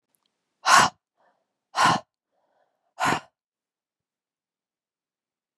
{
  "exhalation_length": "5.6 s",
  "exhalation_amplitude": 30742,
  "exhalation_signal_mean_std_ratio": 0.26,
  "survey_phase": "beta (2021-08-13 to 2022-03-07)",
  "age": "18-44",
  "gender": "Female",
  "wearing_mask": "No",
  "symptom_none": true,
  "symptom_onset": "8 days",
  "smoker_status": "Never smoked",
  "respiratory_condition_asthma": false,
  "respiratory_condition_other": false,
  "recruitment_source": "REACT",
  "submission_delay": "1 day",
  "covid_test_result": "Negative",
  "covid_test_method": "RT-qPCR",
  "influenza_a_test_result": "Negative",
  "influenza_b_test_result": "Negative"
}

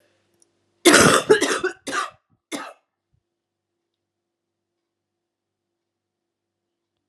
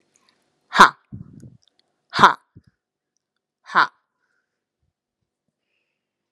{
  "cough_length": "7.1 s",
  "cough_amplitude": 32620,
  "cough_signal_mean_std_ratio": 0.26,
  "exhalation_length": "6.3 s",
  "exhalation_amplitude": 32768,
  "exhalation_signal_mean_std_ratio": 0.18,
  "survey_phase": "alpha (2021-03-01 to 2021-08-12)",
  "age": "45-64",
  "gender": "Female",
  "wearing_mask": "No",
  "symptom_cough_any": true,
  "symptom_shortness_of_breath": true,
  "symptom_abdominal_pain": true,
  "symptom_diarrhoea": true,
  "symptom_fatigue": true,
  "symptom_headache": true,
  "symptom_change_to_sense_of_smell_or_taste": true,
  "symptom_loss_of_taste": true,
  "symptom_onset": "3 days",
  "smoker_status": "Never smoked",
  "respiratory_condition_asthma": false,
  "respiratory_condition_other": false,
  "recruitment_source": "Test and Trace",
  "submission_delay": "2 days",
  "covid_test_result": "Positive",
  "covid_test_method": "RT-qPCR",
  "covid_ct_value": 23.8,
  "covid_ct_gene": "ORF1ab gene",
  "covid_ct_mean": 24.2,
  "covid_viral_load": "12000 copies/ml",
  "covid_viral_load_category": "Low viral load (10K-1M copies/ml)"
}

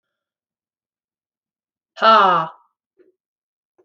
{
  "exhalation_length": "3.8 s",
  "exhalation_amplitude": 29018,
  "exhalation_signal_mean_std_ratio": 0.27,
  "survey_phase": "beta (2021-08-13 to 2022-03-07)",
  "age": "45-64",
  "gender": "Female",
  "wearing_mask": "No",
  "symptom_cough_any": true,
  "symptom_onset": "11 days",
  "smoker_status": "Never smoked",
  "respiratory_condition_asthma": true,
  "respiratory_condition_other": false,
  "recruitment_source": "REACT",
  "submission_delay": "2 days",
  "covid_test_result": "Negative",
  "covid_test_method": "RT-qPCR"
}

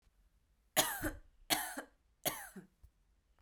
{
  "three_cough_length": "3.4 s",
  "three_cough_amplitude": 6067,
  "three_cough_signal_mean_std_ratio": 0.36,
  "survey_phase": "beta (2021-08-13 to 2022-03-07)",
  "age": "18-44",
  "gender": "Female",
  "wearing_mask": "No",
  "symptom_none": true,
  "smoker_status": "Never smoked",
  "respiratory_condition_asthma": true,
  "respiratory_condition_other": false,
  "recruitment_source": "REACT",
  "submission_delay": "2 days",
  "covid_test_result": "Negative",
  "covid_test_method": "RT-qPCR",
  "influenza_a_test_result": "Negative",
  "influenza_b_test_result": "Negative"
}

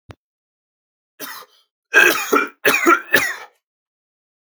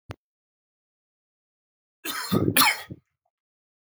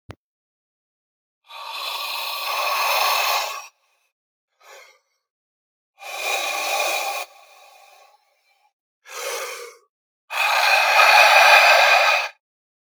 {
  "three_cough_length": "4.5 s",
  "three_cough_amplitude": 32594,
  "three_cough_signal_mean_std_ratio": 0.37,
  "cough_length": "3.8 s",
  "cough_amplitude": 22135,
  "cough_signal_mean_std_ratio": 0.29,
  "exhalation_length": "12.9 s",
  "exhalation_amplitude": 32592,
  "exhalation_signal_mean_std_ratio": 0.48,
  "survey_phase": "beta (2021-08-13 to 2022-03-07)",
  "age": "18-44",
  "gender": "Male",
  "wearing_mask": "No",
  "symptom_runny_or_blocked_nose": true,
  "symptom_onset": "13 days",
  "smoker_status": "Ex-smoker",
  "respiratory_condition_asthma": true,
  "respiratory_condition_other": false,
  "recruitment_source": "REACT",
  "submission_delay": "2 days",
  "covid_test_result": "Negative",
  "covid_test_method": "RT-qPCR",
  "influenza_a_test_result": "Negative",
  "influenza_b_test_result": "Negative"
}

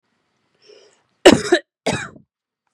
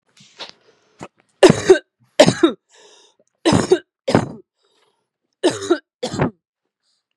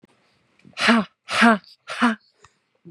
{
  "cough_length": "2.7 s",
  "cough_amplitude": 32768,
  "cough_signal_mean_std_ratio": 0.25,
  "three_cough_length": "7.2 s",
  "three_cough_amplitude": 32768,
  "three_cough_signal_mean_std_ratio": 0.31,
  "exhalation_length": "2.9 s",
  "exhalation_amplitude": 29221,
  "exhalation_signal_mean_std_ratio": 0.39,
  "survey_phase": "beta (2021-08-13 to 2022-03-07)",
  "age": "18-44",
  "gender": "Female",
  "wearing_mask": "No",
  "symptom_none": true,
  "symptom_onset": "12 days",
  "smoker_status": "Never smoked",
  "respiratory_condition_asthma": false,
  "respiratory_condition_other": false,
  "recruitment_source": "REACT",
  "submission_delay": "2 days",
  "covid_test_result": "Negative",
  "covid_test_method": "RT-qPCR",
  "influenza_a_test_result": "Negative",
  "influenza_b_test_result": "Negative"
}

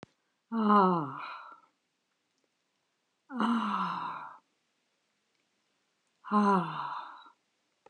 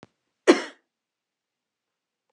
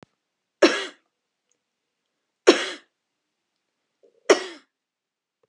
{
  "exhalation_length": "7.9 s",
  "exhalation_amplitude": 9283,
  "exhalation_signal_mean_std_ratio": 0.41,
  "cough_length": "2.3 s",
  "cough_amplitude": 26887,
  "cough_signal_mean_std_ratio": 0.16,
  "three_cough_length": "5.5 s",
  "three_cough_amplitude": 31976,
  "three_cough_signal_mean_std_ratio": 0.2,
  "survey_phase": "beta (2021-08-13 to 2022-03-07)",
  "age": "65+",
  "gender": "Female",
  "wearing_mask": "No",
  "symptom_none": true,
  "smoker_status": "Ex-smoker",
  "respiratory_condition_asthma": false,
  "respiratory_condition_other": false,
  "recruitment_source": "REACT",
  "submission_delay": "3 days",
  "covid_test_result": "Negative",
  "covid_test_method": "RT-qPCR",
  "influenza_a_test_result": "Negative",
  "influenza_b_test_result": "Negative"
}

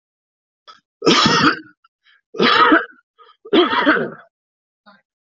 {
  "three_cough_length": "5.4 s",
  "three_cough_amplitude": 29612,
  "three_cough_signal_mean_std_ratio": 0.45,
  "survey_phase": "alpha (2021-03-01 to 2021-08-12)",
  "age": "18-44",
  "gender": "Male",
  "wearing_mask": "No",
  "symptom_none": true,
  "smoker_status": "Current smoker (11 or more cigarettes per day)",
  "respiratory_condition_asthma": true,
  "respiratory_condition_other": false,
  "recruitment_source": "REACT",
  "submission_delay": "4 days",
  "covid_test_result": "Negative",
  "covid_test_method": "RT-qPCR"
}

